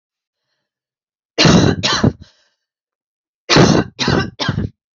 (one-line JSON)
{"cough_length": "4.9 s", "cough_amplitude": 30919, "cough_signal_mean_std_ratio": 0.44, "survey_phase": "alpha (2021-03-01 to 2021-08-12)", "age": "18-44", "gender": "Female", "wearing_mask": "No", "symptom_cough_any": true, "symptom_new_continuous_cough": true, "symptom_shortness_of_breath": true, "symptom_fatigue": true, "symptom_headache": true, "symptom_change_to_sense_of_smell_or_taste": true, "symptom_loss_of_taste": true, "symptom_onset": "2 days", "smoker_status": "Ex-smoker", "respiratory_condition_asthma": true, "respiratory_condition_other": false, "recruitment_source": "Test and Trace", "submission_delay": "2 days", "covid_test_result": "Positive", "covid_test_method": "RT-qPCR", "covid_ct_value": 16.2, "covid_ct_gene": "ORF1ab gene", "covid_ct_mean": 16.9, "covid_viral_load": "3000000 copies/ml", "covid_viral_load_category": "High viral load (>1M copies/ml)"}